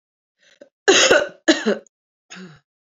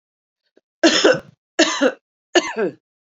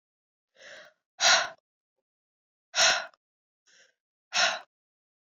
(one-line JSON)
{"cough_length": "2.8 s", "cough_amplitude": 30479, "cough_signal_mean_std_ratio": 0.37, "three_cough_length": "3.2 s", "three_cough_amplitude": 30986, "three_cough_signal_mean_std_ratio": 0.41, "exhalation_length": "5.2 s", "exhalation_amplitude": 12447, "exhalation_signal_mean_std_ratio": 0.3, "survey_phase": "beta (2021-08-13 to 2022-03-07)", "age": "45-64", "gender": "Female", "wearing_mask": "No", "symptom_cough_any": true, "symptom_runny_or_blocked_nose": true, "symptom_sore_throat": true, "symptom_fatigue": true, "symptom_headache": true, "symptom_change_to_sense_of_smell_or_taste": true, "symptom_onset": "4 days", "smoker_status": "Never smoked", "respiratory_condition_asthma": false, "respiratory_condition_other": false, "recruitment_source": "Test and Trace", "submission_delay": "2 days", "covid_test_result": "Positive", "covid_test_method": "RT-qPCR"}